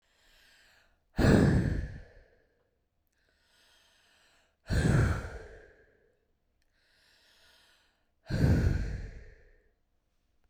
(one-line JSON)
{"exhalation_length": "10.5 s", "exhalation_amplitude": 11803, "exhalation_signal_mean_std_ratio": 0.36, "survey_phase": "beta (2021-08-13 to 2022-03-07)", "age": "45-64", "gender": "Female", "wearing_mask": "No", "symptom_none": true, "smoker_status": "Never smoked", "respiratory_condition_asthma": false, "respiratory_condition_other": false, "recruitment_source": "Test and Trace", "submission_delay": "0 days", "covid_test_result": "Negative", "covid_test_method": "LFT"}